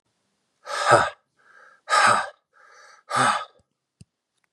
{"exhalation_length": "4.5 s", "exhalation_amplitude": 29672, "exhalation_signal_mean_std_ratio": 0.38, "survey_phase": "beta (2021-08-13 to 2022-03-07)", "age": "18-44", "gender": "Male", "wearing_mask": "No", "symptom_runny_or_blocked_nose": true, "smoker_status": "Never smoked", "respiratory_condition_asthma": true, "respiratory_condition_other": false, "recruitment_source": "Test and Trace", "submission_delay": "2 days", "covid_test_result": "Positive", "covid_test_method": "RT-qPCR", "covid_ct_value": 29.6, "covid_ct_gene": "ORF1ab gene"}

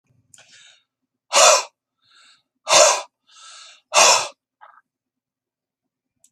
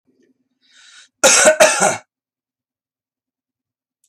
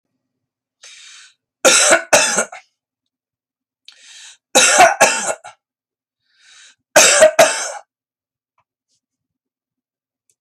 {"exhalation_length": "6.3 s", "exhalation_amplitude": 32767, "exhalation_signal_mean_std_ratio": 0.31, "cough_length": "4.1 s", "cough_amplitude": 32768, "cough_signal_mean_std_ratio": 0.32, "three_cough_length": "10.4 s", "three_cough_amplitude": 32768, "three_cough_signal_mean_std_ratio": 0.35, "survey_phase": "beta (2021-08-13 to 2022-03-07)", "age": "45-64", "gender": "Male", "wearing_mask": "No", "symptom_none": true, "smoker_status": "Ex-smoker", "respiratory_condition_asthma": false, "respiratory_condition_other": false, "recruitment_source": "REACT", "submission_delay": "2 days", "covid_test_result": "Negative", "covid_test_method": "RT-qPCR"}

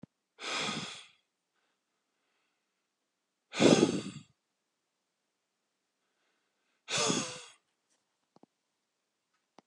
{"exhalation_length": "9.7 s", "exhalation_amplitude": 10966, "exhalation_signal_mean_std_ratio": 0.25, "survey_phase": "beta (2021-08-13 to 2022-03-07)", "age": "45-64", "gender": "Male", "wearing_mask": "No", "symptom_headache": true, "symptom_change_to_sense_of_smell_or_taste": true, "symptom_loss_of_taste": true, "symptom_other": true, "symptom_onset": "4 days", "smoker_status": "Ex-smoker", "respiratory_condition_asthma": false, "respiratory_condition_other": false, "recruitment_source": "Test and Trace", "submission_delay": "2 days", "covid_test_result": "Positive", "covid_test_method": "ePCR"}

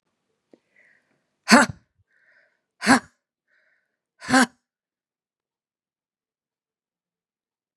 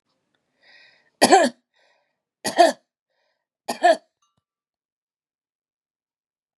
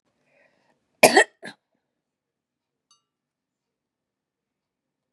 {"exhalation_length": "7.8 s", "exhalation_amplitude": 29924, "exhalation_signal_mean_std_ratio": 0.19, "three_cough_length": "6.6 s", "three_cough_amplitude": 31083, "three_cough_signal_mean_std_ratio": 0.24, "cough_length": "5.1 s", "cough_amplitude": 32767, "cough_signal_mean_std_ratio": 0.14, "survey_phase": "beta (2021-08-13 to 2022-03-07)", "age": "65+", "gender": "Female", "wearing_mask": "No", "symptom_none": true, "smoker_status": "Ex-smoker", "respiratory_condition_asthma": false, "respiratory_condition_other": false, "recruitment_source": "REACT", "submission_delay": "1 day", "covid_test_result": "Negative", "covid_test_method": "RT-qPCR", "influenza_a_test_result": "Negative", "influenza_b_test_result": "Negative"}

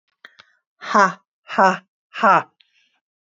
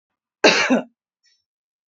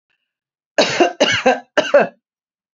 {"exhalation_length": "3.3 s", "exhalation_amplitude": 28086, "exhalation_signal_mean_std_ratio": 0.33, "cough_length": "1.9 s", "cough_amplitude": 29414, "cough_signal_mean_std_ratio": 0.34, "three_cough_length": "2.7 s", "three_cough_amplitude": 29133, "three_cough_signal_mean_std_ratio": 0.44, "survey_phase": "beta (2021-08-13 to 2022-03-07)", "age": "45-64", "gender": "Female", "wearing_mask": "No", "symptom_none": true, "smoker_status": "Never smoked", "respiratory_condition_asthma": false, "respiratory_condition_other": false, "recruitment_source": "REACT", "submission_delay": "1 day", "covid_test_result": "Negative", "covid_test_method": "RT-qPCR"}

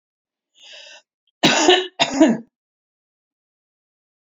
{"cough_length": "4.3 s", "cough_amplitude": 31671, "cough_signal_mean_std_ratio": 0.33, "survey_phase": "alpha (2021-03-01 to 2021-08-12)", "age": "65+", "gender": "Female", "wearing_mask": "No", "symptom_none": true, "smoker_status": "Never smoked", "respiratory_condition_asthma": false, "respiratory_condition_other": false, "recruitment_source": "REACT", "submission_delay": "5 days", "covid_test_result": "Negative", "covid_test_method": "RT-qPCR"}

